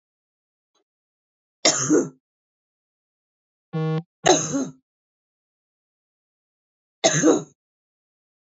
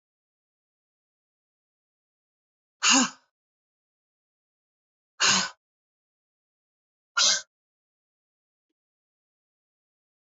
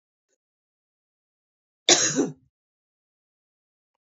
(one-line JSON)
{"three_cough_length": "8.5 s", "three_cough_amplitude": 23698, "three_cough_signal_mean_std_ratio": 0.31, "exhalation_length": "10.3 s", "exhalation_amplitude": 14887, "exhalation_signal_mean_std_ratio": 0.21, "cough_length": "4.0 s", "cough_amplitude": 26704, "cough_signal_mean_std_ratio": 0.22, "survey_phase": "beta (2021-08-13 to 2022-03-07)", "age": "45-64", "gender": "Female", "wearing_mask": "No", "symptom_none": true, "smoker_status": "Ex-smoker", "respiratory_condition_asthma": false, "respiratory_condition_other": false, "recruitment_source": "REACT", "submission_delay": "2 days", "covid_test_result": "Negative", "covid_test_method": "RT-qPCR"}